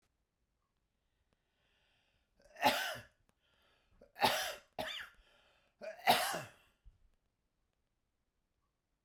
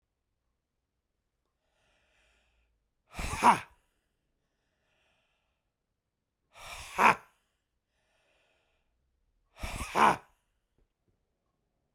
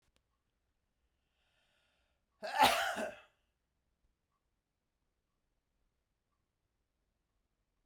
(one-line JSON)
{"three_cough_length": "9.0 s", "three_cough_amplitude": 5657, "three_cough_signal_mean_std_ratio": 0.28, "exhalation_length": "11.9 s", "exhalation_amplitude": 16439, "exhalation_signal_mean_std_ratio": 0.19, "cough_length": "7.9 s", "cough_amplitude": 6437, "cough_signal_mean_std_ratio": 0.2, "survey_phase": "beta (2021-08-13 to 2022-03-07)", "age": "65+", "gender": "Male", "wearing_mask": "No", "symptom_new_continuous_cough": true, "symptom_runny_or_blocked_nose": true, "symptom_fatigue": true, "symptom_headache": true, "symptom_other": true, "symptom_onset": "5 days", "smoker_status": "Ex-smoker", "respiratory_condition_asthma": false, "respiratory_condition_other": false, "recruitment_source": "Test and Trace", "submission_delay": "1 day", "covid_test_result": "Positive", "covid_test_method": "RT-qPCR", "covid_ct_value": 28.8, "covid_ct_gene": "ORF1ab gene"}